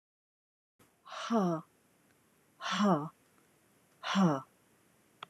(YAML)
exhalation_length: 5.3 s
exhalation_amplitude: 5349
exhalation_signal_mean_std_ratio: 0.38
survey_phase: alpha (2021-03-01 to 2021-08-12)
age: 45-64
gender: Female
wearing_mask: 'No'
symptom_none: true
smoker_status: Never smoked
respiratory_condition_asthma: false
respiratory_condition_other: false
recruitment_source: REACT
submission_delay: 3 days
covid_test_result: Negative
covid_test_method: RT-qPCR